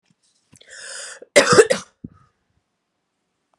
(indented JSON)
{
  "cough_length": "3.6 s",
  "cough_amplitude": 32767,
  "cough_signal_mean_std_ratio": 0.25,
  "survey_phase": "beta (2021-08-13 to 2022-03-07)",
  "age": "45-64",
  "gender": "Female",
  "wearing_mask": "No",
  "symptom_runny_or_blocked_nose": true,
  "symptom_fatigue": true,
  "symptom_change_to_sense_of_smell_or_taste": true,
  "symptom_onset": "3 days",
  "smoker_status": "Current smoker (1 to 10 cigarettes per day)",
  "respiratory_condition_asthma": false,
  "respiratory_condition_other": false,
  "recruitment_source": "Test and Trace",
  "submission_delay": "2 days",
  "covid_test_result": "Positive",
  "covid_test_method": "RT-qPCR",
  "covid_ct_value": 18.4,
  "covid_ct_gene": "N gene"
}